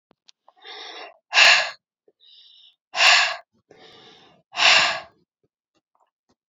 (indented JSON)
{
  "exhalation_length": "6.5 s",
  "exhalation_amplitude": 32767,
  "exhalation_signal_mean_std_ratio": 0.34,
  "survey_phase": "beta (2021-08-13 to 2022-03-07)",
  "age": "18-44",
  "gender": "Female",
  "wearing_mask": "No",
  "symptom_cough_any": true,
  "symptom_fatigue": true,
  "symptom_headache": true,
  "symptom_change_to_sense_of_smell_or_taste": true,
  "symptom_loss_of_taste": true,
  "symptom_other": true,
  "symptom_onset": "4 days",
  "smoker_status": "Never smoked",
  "respiratory_condition_asthma": false,
  "respiratory_condition_other": false,
  "recruitment_source": "Test and Trace",
  "submission_delay": "2 days",
  "covid_test_result": "Positive",
  "covid_test_method": "RT-qPCR",
  "covid_ct_value": 23.9,
  "covid_ct_gene": "N gene"
}